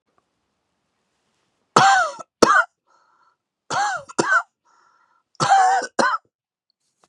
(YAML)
three_cough_length: 7.1 s
three_cough_amplitude: 32768
three_cough_signal_mean_std_ratio: 0.39
survey_phase: beta (2021-08-13 to 2022-03-07)
age: 45-64
gender: Male
wearing_mask: 'No'
symptom_cough_any: true
symptom_runny_or_blocked_nose: true
symptom_sore_throat: true
symptom_diarrhoea: true
symptom_fatigue: true
symptom_fever_high_temperature: true
symptom_headache: true
symptom_onset: 2 days
smoker_status: Never smoked
respiratory_condition_asthma: false
respiratory_condition_other: false
recruitment_source: Test and Trace
submission_delay: 2 days
covid_test_result: Positive
covid_test_method: RT-qPCR
covid_ct_value: 20.1
covid_ct_gene: ORF1ab gene
covid_ct_mean: 20.3
covid_viral_load: 220000 copies/ml
covid_viral_load_category: Low viral load (10K-1M copies/ml)